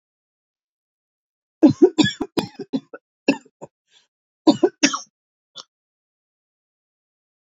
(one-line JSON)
{"cough_length": "7.4 s", "cough_amplitude": 28657, "cough_signal_mean_std_ratio": 0.24, "survey_phase": "beta (2021-08-13 to 2022-03-07)", "age": "45-64", "gender": "Female", "wearing_mask": "No", "symptom_cough_any": true, "symptom_sore_throat": true, "symptom_diarrhoea": true, "symptom_fatigue": true, "symptom_fever_high_temperature": true, "symptom_headache": true, "symptom_change_to_sense_of_smell_or_taste": true, "symptom_loss_of_taste": true, "symptom_onset": "4 days", "smoker_status": "Never smoked", "respiratory_condition_asthma": false, "respiratory_condition_other": false, "recruitment_source": "Test and Trace", "submission_delay": "1 day", "covid_test_result": "Positive", "covid_test_method": "RT-qPCR", "covid_ct_value": 22.3, "covid_ct_gene": "ORF1ab gene"}